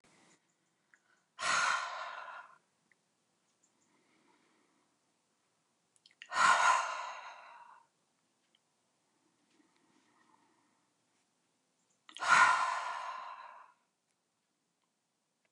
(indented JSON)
{
  "exhalation_length": "15.5 s",
  "exhalation_amplitude": 7608,
  "exhalation_signal_mean_std_ratio": 0.3,
  "survey_phase": "beta (2021-08-13 to 2022-03-07)",
  "age": "65+",
  "gender": "Female",
  "wearing_mask": "No",
  "symptom_none": true,
  "smoker_status": "Ex-smoker",
  "respiratory_condition_asthma": false,
  "respiratory_condition_other": false,
  "recruitment_source": "REACT",
  "submission_delay": "2 days",
  "covid_test_result": "Negative",
  "covid_test_method": "RT-qPCR"
}